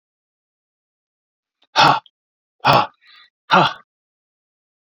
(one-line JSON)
{"exhalation_length": "4.9 s", "exhalation_amplitude": 29663, "exhalation_signal_mean_std_ratio": 0.28, "survey_phase": "beta (2021-08-13 to 2022-03-07)", "age": "45-64", "gender": "Male", "wearing_mask": "No", "symptom_none": true, "smoker_status": "Never smoked", "respiratory_condition_asthma": false, "respiratory_condition_other": false, "recruitment_source": "REACT", "submission_delay": "2 days", "covid_test_result": "Negative", "covid_test_method": "RT-qPCR"}